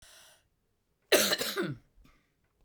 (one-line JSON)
{"cough_length": "2.6 s", "cough_amplitude": 11248, "cough_signal_mean_std_ratio": 0.35, "survey_phase": "beta (2021-08-13 to 2022-03-07)", "age": "45-64", "gender": "Female", "wearing_mask": "No", "symptom_new_continuous_cough": true, "symptom_runny_or_blocked_nose": true, "symptom_shortness_of_breath": true, "symptom_fatigue": true, "symptom_fever_high_temperature": true, "symptom_headache": true, "symptom_onset": "3 days", "smoker_status": "Never smoked", "respiratory_condition_asthma": false, "respiratory_condition_other": false, "recruitment_source": "Test and Trace", "submission_delay": "1 day", "covid_test_result": "Positive", "covid_test_method": "RT-qPCR", "covid_ct_value": 23.2, "covid_ct_gene": "ORF1ab gene"}